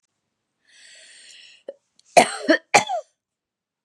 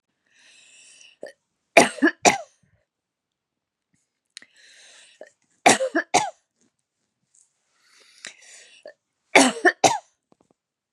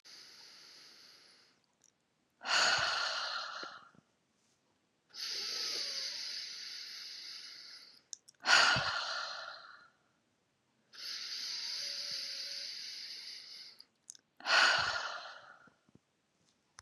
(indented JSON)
{
  "cough_length": "3.8 s",
  "cough_amplitude": 32767,
  "cough_signal_mean_std_ratio": 0.25,
  "three_cough_length": "10.9 s",
  "three_cough_amplitude": 32768,
  "three_cough_signal_mean_std_ratio": 0.24,
  "exhalation_length": "16.8 s",
  "exhalation_amplitude": 8636,
  "exhalation_signal_mean_std_ratio": 0.47,
  "survey_phase": "beta (2021-08-13 to 2022-03-07)",
  "age": "45-64",
  "gender": "Female",
  "wearing_mask": "No",
  "symptom_fatigue": true,
  "symptom_headache": true,
  "smoker_status": "Never smoked",
  "respiratory_condition_asthma": false,
  "respiratory_condition_other": false,
  "recruitment_source": "REACT",
  "submission_delay": "1 day",
  "covid_test_result": "Negative",
  "covid_test_method": "RT-qPCR",
  "influenza_a_test_result": "Negative",
  "influenza_b_test_result": "Negative"
}